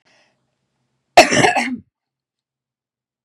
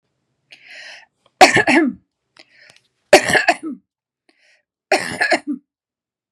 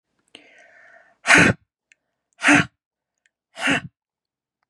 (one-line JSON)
{"cough_length": "3.2 s", "cough_amplitude": 32768, "cough_signal_mean_std_ratio": 0.27, "three_cough_length": "6.3 s", "three_cough_amplitude": 32768, "three_cough_signal_mean_std_ratio": 0.33, "exhalation_length": "4.7 s", "exhalation_amplitude": 32192, "exhalation_signal_mean_std_ratio": 0.29, "survey_phase": "beta (2021-08-13 to 2022-03-07)", "age": "45-64", "gender": "Female", "wearing_mask": "No", "symptom_none": true, "smoker_status": "Ex-smoker", "respiratory_condition_asthma": false, "respiratory_condition_other": false, "recruitment_source": "REACT", "submission_delay": "3 days", "covid_test_result": "Negative", "covid_test_method": "RT-qPCR", "influenza_a_test_result": "Negative", "influenza_b_test_result": "Negative"}